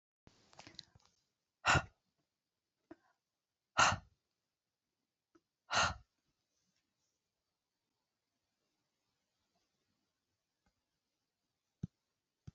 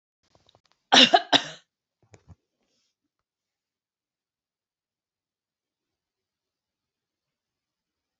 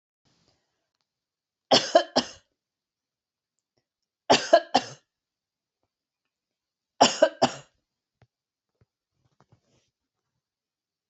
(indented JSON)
{
  "exhalation_length": "12.5 s",
  "exhalation_amplitude": 5190,
  "exhalation_signal_mean_std_ratio": 0.17,
  "cough_length": "8.2 s",
  "cough_amplitude": 27018,
  "cough_signal_mean_std_ratio": 0.15,
  "three_cough_length": "11.1 s",
  "three_cough_amplitude": 22271,
  "three_cough_signal_mean_std_ratio": 0.2,
  "survey_phase": "alpha (2021-03-01 to 2021-08-12)",
  "age": "45-64",
  "gender": "Female",
  "wearing_mask": "No",
  "symptom_none": true,
  "smoker_status": "Ex-smoker",
  "respiratory_condition_asthma": false,
  "respiratory_condition_other": false,
  "recruitment_source": "REACT",
  "submission_delay": "2 days",
  "covid_test_result": "Negative",
  "covid_test_method": "RT-qPCR"
}